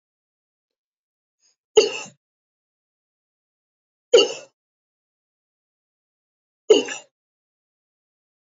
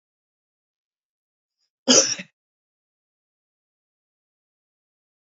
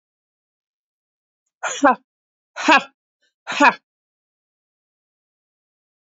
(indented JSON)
{
  "three_cough_length": "8.5 s",
  "three_cough_amplitude": 29536,
  "three_cough_signal_mean_std_ratio": 0.17,
  "cough_length": "5.2 s",
  "cough_amplitude": 29902,
  "cough_signal_mean_std_ratio": 0.16,
  "exhalation_length": "6.1 s",
  "exhalation_amplitude": 28464,
  "exhalation_signal_mean_std_ratio": 0.22,
  "survey_phase": "beta (2021-08-13 to 2022-03-07)",
  "age": "18-44",
  "gender": "Female",
  "wearing_mask": "No",
  "symptom_runny_or_blocked_nose": true,
  "symptom_fatigue": true,
  "symptom_change_to_sense_of_smell_or_taste": true,
  "smoker_status": "Never smoked",
  "respiratory_condition_asthma": false,
  "respiratory_condition_other": false,
  "recruitment_source": "Test and Trace",
  "submission_delay": "2 days",
  "covid_test_result": "Positive",
  "covid_test_method": "RT-qPCR",
  "covid_ct_value": 26.2,
  "covid_ct_gene": "ORF1ab gene"
}